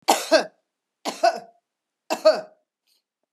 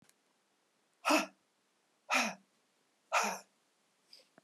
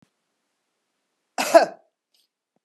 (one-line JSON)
{"three_cough_length": "3.3 s", "three_cough_amplitude": 25039, "three_cough_signal_mean_std_ratio": 0.33, "exhalation_length": "4.4 s", "exhalation_amplitude": 4719, "exhalation_signal_mean_std_ratio": 0.31, "cough_length": "2.6 s", "cough_amplitude": 30064, "cough_signal_mean_std_ratio": 0.2, "survey_phase": "beta (2021-08-13 to 2022-03-07)", "age": "65+", "gender": "Female", "wearing_mask": "No", "symptom_none": true, "smoker_status": "Never smoked", "respiratory_condition_asthma": false, "respiratory_condition_other": false, "recruitment_source": "REACT", "submission_delay": "3 days", "covid_test_result": "Negative", "covid_test_method": "RT-qPCR"}